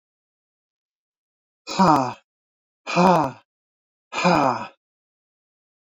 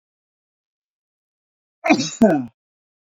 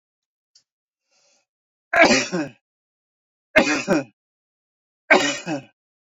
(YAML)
exhalation_length: 5.9 s
exhalation_amplitude: 26409
exhalation_signal_mean_std_ratio: 0.34
cough_length: 3.2 s
cough_amplitude: 27456
cough_signal_mean_std_ratio: 0.28
three_cough_length: 6.1 s
three_cough_amplitude: 31136
three_cough_signal_mean_std_ratio: 0.33
survey_phase: beta (2021-08-13 to 2022-03-07)
age: 65+
gender: Male
wearing_mask: 'No'
symptom_none: true
smoker_status: Never smoked
respiratory_condition_asthma: false
respiratory_condition_other: false
recruitment_source: REACT
submission_delay: 2 days
covid_test_result: Negative
covid_test_method: RT-qPCR